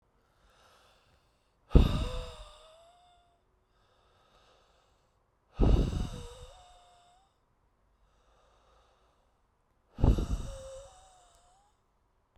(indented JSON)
{
  "exhalation_length": "12.4 s",
  "exhalation_amplitude": 19499,
  "exhalation_signal_mean_std_ratio": 0.26,
  "survey_phase": "beta (2021-08-13 to 2022-03-07)",
  "age": "45-64",
  "gender": "Male",
  "wearing_mask": "No",
  "symptom_cough_any": true,
  "symptom_runny_or_blocked_nose": true,
  "symptom_shortness_of_breath": true,
  "symptom_fatigue": true,
  "symptom_headache": true,
  "symptom_onset": "3 days",
  "smoker_status": "Never smoked",
  "respiratory_condition_asthma": true,
  "respiratory_condition_other": false,
  "recruitment_source": "Test and Trace",
  "submission_delay": "2 days",
  "covid_test_result": "Positive",
  "covid_test_method": "RT-qPCR"
}